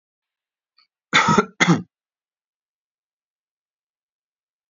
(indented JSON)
{
  "cough_length": "4.7 s",
  "cough_amplitude": 29600,
  "cough_signal_mean_std_ratio": 0.25,
  "survey_phase": "alpha (2021-03-01 to 2021-08-12)",
  "age": "18-44",
  "gender": "Male",
  "wearing_mask": "No",
  "symptom_cough_any": true,
  "symptom_fatigue": true,
  "symptom_fever_high_temperature": true,
  "smoker_status": "Never smoked",
  "respiratory_condition_asthma": false,
  "respiratory_condition_other": false,
  "recruitment_source": "Test and Trace",
  "submission_delay": "2 days",
  "covid_test_result": "Positive",
  "covid_test_method": "LFT"
}